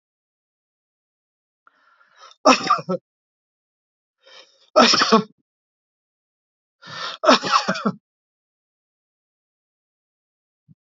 {
  "three_cough_length": "10.8 s",
  "three_cough_amplitude": 29327,
  "three_cough_signal_mean_std_ratio": 0.26,
  "survey_phase": "alpha (2021-03-01 to 2021-08-12)",
  "age": "65+",
  "gender": "Male",
  "wearing_mask": "No",
  "symptom_none": true,
  "smoker_status": "Ex-smoker",
  "respiratory_condition_asthma": false,
  "respiratory_condition_other": false,
  "recruitment_source": "REACT",
  "submission_delay": "-1 day",
  "covid_test_result": "Negative",
  "covid_test_method": "RT-qPCR"
}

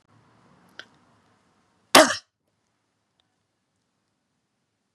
{
  "cough_length": "4.9 s",
  "cough_amplitude": 32768,
  "cough_signal_mean_std_ratio": 0.14,
  "survey_phase": "beta (2021-08-13 to 2022-03-07)",
  "age": "45-64",
  "gender": "Female",
  "wearing_mask": "No",
  "symptom_none": true,
  "smoker_status": "Never smoked",
  "respiratory_condition_asthma": false,
  "respiratory_condition_other": false,
  "recruitment_source": "REACT",
  "submission_delay": "2 days",
  "covid_test_result": "Negative",
  "covid_test_method": "RT-qPCR",
  "influenza_a_test_result": "Negative",
  "influenza_b_test_result": "Negative"
}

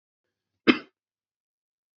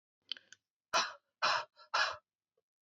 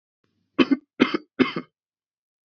{
  "cough_length": "2.0 s",
  "cough_amplitude": 23450,
  "cough_signal_mean_std_ratio": 0.14,
  "exhalation_length": "2.8 s",
  "exhalation_amplitude": 4111,
  "exhalation_signal_mean_std_ratio": 0.37,
  "three_cough_length": "2.5 s",
  "three_cough_amplitude": 25062,
  "three_cough_signal_mean_std_ratio": 0.28,
  "survey_phase": "beta (2021-08-13 to 2022-03-07)",
  "age": "18-44",
  "gender": "Female",
  "wearing_mask": "No",
  "symptom_runny_or_blocked_nose": true,
  "symptom_onset": "5 days",
  "smoker_status": "Never smoked",
  "respiratory_condition_asthma": true,
  "respiratory_condition_other": false,
  "recruitment_source": "REACT",
  "submission_delay": "2 days",
  "covid_test_result": "Positive",
  "covid_test_method": "RT-qPCR",
  "covid_ct_value": 17.9,
  "covid_ct_gene": "E gene",
  "influenza_a_test_result": "Negative",
  "influenza_b_test_result": "Negative"
}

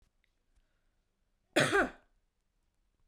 {
  "cough_length": "3.1 s",
  "cough_amplitude": 7009,
  "cough_signal_mean_std_ratio": 0.25,
  "survey_phase": "beta (2021-08-13 to 2022-03-07)",
  "age": "18-44",
  "gender": "Female",
  "wearing_mask": "No",
  "symptom_none": true,
  "smoker_status": "Never smoked",
  "respiratory_condition_asthma": false,
  "respiratory_condition_other": false,
  "recruitment_source": "REACT",
  "submission_delay": "4 days",
  "covid_test_result": "Negative",
  "covid_test_method": "RT-qPCR"
}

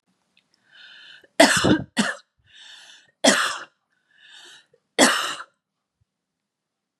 {
  "three_cough_length": "7.0 s",
  "three_cough_amplitude": 32203,
  "three_cough_signal_mean_std_ratio": 0.32,
  "survey_phase": "beta (2021-08-13 to 2022-03-07)",
  "age": "18-44",
  "gender": "Female",
  "wearing_mask": "No",
  "symptom_cough_any": true,
  "symptom_onset": "5 days",
  "smoker_status": "Never smoked",
  "respiratory_condition_asthma": true,
  "respiratory_condition_other": false,
  "recruitment_source": "REACT",
  "submission_delay": "2 days",
  "covid_test_result": "Negative",
  "covid_test_method": "RT-qPCR",
  "influenza_a_test_result": "Negative",
  "influenza_b_test_result": "Negative"
}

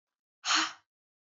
{
  "exhalation_length": "1.3 s",
  "exhalation_amplitude": 6972,
  "exhalation_signal_mean_std_ratio": 0.35,
  "survey_phase": "beta (2021-08-13 to 2022-03-07)",
  "age": "18-44",
  "gender": "Female",
  "wearing_mask": "No",
  "symptom_runny_or_blocked_nose": true,
  "symptom_fatigue": true,
  "symptom_headache": true,
  "symptom_other": true,
  "smoker_status": "Never smoked",
  "respiratory_condition_asthma": false,
  "respiratory_condition_other": false,
  "recruitment_source": "Test and Trace",
  "submission_delay": "2 days",
  "covid_test_result": "Positive",
  "covid_test_method": "RT-qPCR",
  "covid_ct_value": 19.5,
  "covid_ct_gene": "ORF1ab gene",
  "covid_ct_mean": 19.9,
  "covid_viral_load": "300000 copies/ml",
  "covid_viral_load_category": "Low viral load (10K-1M copies/ml)"
}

